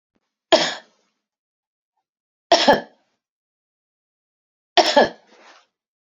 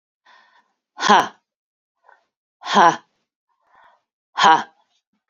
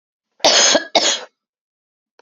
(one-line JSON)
{"three_cough_length": "6.1 s", "three_cough_amplitude": 30498, "three_cough_signal_mean_std_ratio": 0.25, "exhalation_length": "5.3 s", "exhalation_amplitude": 29002, "exhalation_signal_mean_std_ratio": 0.28, "cough_length": "2.2 s", "cough_amplitude": 32768, "cough_signal_mean_std_ratio": 0.43, "survey_phase": "beta (2021-08-13 to 2022-03-07)", "age": "45-64", "gender": "Female", "wearing_mask": "No", "symptom_none": true, "smoker_status": "Never smoked", "respiratory_condition_asthma": false, "respiratory_condition_other": false, "recruitment_source": "REACT", "submission_delay": "2 days", "covid_test_result": "Negative", "covid_test_method": "RT-qPCR", "influenza_a_test_result": "Negative", "influenza_b_test_result": "Negative"}